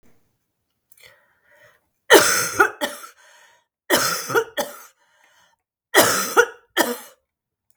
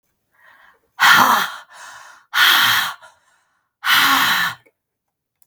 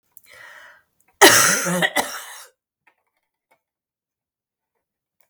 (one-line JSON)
{"three_cough_length": "7.8 s", "three_cough_amplitude": 32768, "three_cough_signal_mean_std_ratio": 0.35, "exhalation_length": "5.5 s", "exhalation_amplitude": 32768, "exhalation_signal_mean_std_ratio": 0.48, "cough_length": "5.3 s", "cough_amplitude": 32768, "cough_signal_mean_std_ratio": 0.29, "survey_phase": "beta (2021-08-13 to 2022-03-07)", "age": "65+", "gender": "Female", "wearing_mask": "No", "symptom_cough_any": true, "smoker_status": "Ex-smoker", "respiratory_condition_asthma": false, "respiratory_condition_other": false, "recruitment_source": "Test and Trace", "submission_delay": "1 day", "covid_test_result": "Positive", "covid_test_method": "LFT"}